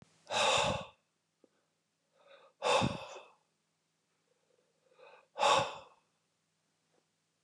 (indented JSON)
{
  "exhalation_length": "7.4 s",
  "exhalation_amplitude": 5270,
  "exhalation_signal_mean_std_ratio": 0.33,
  "survey_phase": "beta (2021-08-13 to 2022-03-07)",
  "age": "45-64",
  "gender": "Male",
  "wearing_mask": "No",
  "symptom_none": true,
  "smoker_status": "Ex-smoker",
  "respiratory_condition_asthma": false,
  "respiratory_condition_other": false,
  "recruitment_source": "REACT",
  "submission_delay": "0 days",
  "covid_test_result": "Negative",
  "covid_test_method": "RT-qPCR",
  "influenza_a_test_result": "Negative",
  "influenza_b_test_result": "Negative"
}